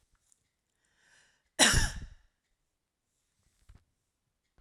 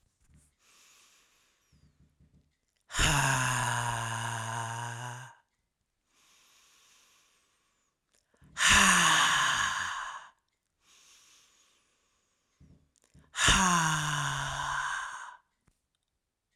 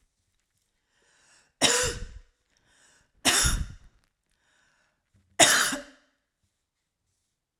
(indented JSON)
{
  "cough_length": "4.6 s",
  "cough_amplitude": 14050,
  "cough_signal_mean_std_ratio": 0.22,
  "exhalation_length": "16.6 s",
  "exhalation_amplitude": 11130,
  "exhalation_signal_mean_std_ratio": 0.44,
  "three_cough_length": "7.6 s",
  "three_cough_amplitude": 23776,
  "three_cough_signal_mean_std_ratio": 0.3,
  "survey_phase": "beta (2021-08-13 to 2022-03-07)",
  "age": "45-64",
  "gender": "Female",
  "wearing_mask": "No",
  "symptom_none": true,
  "smoker_status": "Ex-smoker",
  "respiratory_condition_asthma": false,
  "respiratory_condition_other": false,
  "recruitment_source": "REACT",
  "submission_delay": "1 day",
  "covid_test_result": "Negative",
  "covid_test_method": "RT-qPCR"
}